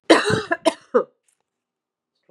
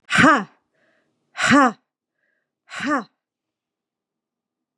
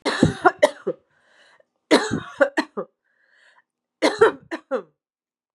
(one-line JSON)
{"cough_length": "2.3 s", "cough_amplitude": 32767, "cough_signal_mean_std_ratio": 0.34, "exhalation_length": "4.8 s", "exhalation_amplitude": 29671, "exhalation_signal_mean_std_ratio": 0.32, "three_cough_length": "5.5 s", "three_cough_amplitude": 31640, "three_cough_signal_mean_std_ratio": 0.34, "survey_phase": "beta (2021-08-13 to 2022-03-07)", "age": "45-64", "gender": "Female", "wearing_mask": "No", "symptom_cough_any": true, "symptom_runny_or_blocked_nose": true, "symptom_onset": "2 days", "smoker_status": "Never smoked", "respiratory_condition_asthma": false, "respiratory_condition_other": true, "recruitment_source": "Test and Trace", "submission_delay": "1 day", "covid_test_result": "Positive", "covid_test_method": "ePCR"}